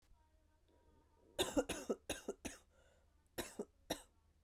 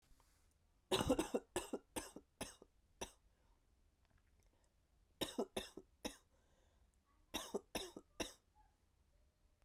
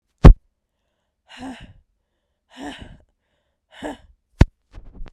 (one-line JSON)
{"cough_length": "4.4 s", "cough_amplitude": 2523, "cough_signal_mean_std_ratio": 0.34, "three_cough_length": "9.6 s", "three_cough_amplitude": 2494, "three_cough_signal_mean_std_ratio": 0.31, "exhalation_length": "5.1 s", "exhalation_amplitude": 32768, "exhalation_signal_mean_std_ratio": 0.16, "survey_phase": "beta (2021-08-13 to 2022-03-07)", "age": "18-44", "gender": "Female", "wearing_mask": "No", "symptom_cough_any": true, "symptom_runny_or_blocked_nose": true, "symptom_shortness_of_breath": true, "symptom_sore_throat": true, "symptom_fatigue": true, "symptom_headache": true, "symptom_other": true, "smoker_status": "Never smoked", "respiratory_condition_asthma": true, "respiratory_condition_other": false, "recruitment_source": "Test and Trace", "submission_delay": "1 day", "covid_test_result": "Positive", "covid_test_method": "RT-qPCR", "covid_ct_value": 20.2, "covid_ct_gene": "N gene"}